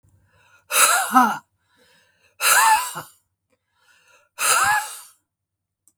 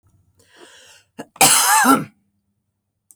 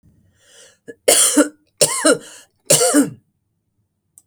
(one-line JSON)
{"exhalation_length": "6.0 s", "exhalation_amplitude": 28797, "exhalation_signal_mean_std_ratio": 0.42, "cough_length": "3.2 s", "cough_amplitude": 32768, "cough_signal_mean_std_ratio": 0.38, "three_cough_length": "4.3 s", "three_cough_amplitude": 32768, "three_cough_signal_mean_std_ratio": 0.41, "survey_phase": "beta (2021-08-13 to 2022-03-07)", "age": "65+", "gender": "Female", "wearing_mask": "No", "symptom_none": true, "smoker_status": "Ex-smoker", "respiratory_condition_asthma": false, "respiratory_condition_other": false, "recruitment_source": "REACT", "submission_delay": "2 days", "covid_test_result": "Negative", "covid_test_method": "RT-qPCR", "influenza_a_test_result": "Negative", "influenza_b_test_result": "Negative"}